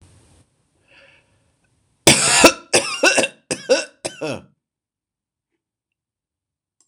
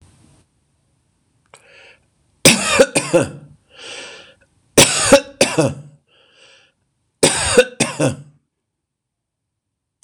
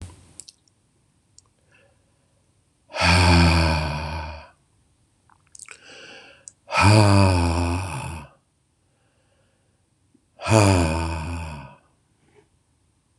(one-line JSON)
{"cough_length": "6.9 s", "cough_amplitude": 26028, "cough_signal_mean_std_ratio": 0.31, "three_cough_length": "10.0 s", "three_cough_amplitude": 26028, "three_cough_signal_mean_std_ratio": 0.34, "exhalation_length": "13.2 s", "exhalation_amplitude": 25933, "exhalation_signal_mean_std_ratio": 0.43, "survey_phase": "beta (2021-08-13 to 2022-03-07)", "age": "65+", "gender": "Male", "wearing_mask": "No", "symptom_none": true, "smoker_status": "Never smoked", "respiratory_condition_asthma": false, "respiratory_condition_other": false, "recruitment_source": "Test and Trace", "submission_delay": "1 day", "covid_test_result": "Negative", "covid_test_method": "RT-qPCR"}